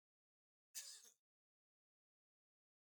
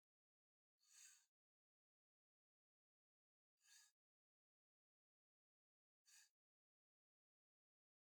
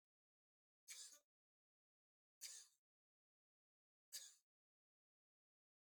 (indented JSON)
{
  "cough_length": "3.0 s",
  "cough_amplitude": 552,
  "cough_signal_mean_std_ratio": 0.23,
  "exhalation_length": "8.2 s",
  "exhalation_amplitude": 60,
  "exhalation_signal_mean_std_ratio": 0.24,
  "three_cough_length": "5.9 s",
  "three_cough_amplitude": 411,
  "three_cough_signal_mean_std_ratio": 0.26,
  "survey_phase": "beta (2021-08-13 to 2022-03-07)",
  "age": "65+",
  "gender": "Male",
  "wearing_mask": "No",
  "symptom_none": true,
  "smoker_status": "Never smoked",
  "respiratory_condition_asthma": false,
  "respiratory_condition_other": false,
  "recruitment_source": "REACT",
  "submission_delay": "4 days",
  "covid_test_result": "Negative",
  "covid_test_method": "RT-qPCR",
  "influenza_a_test_result": "Negative",
  "influenza_b_test_result": "Negative"
}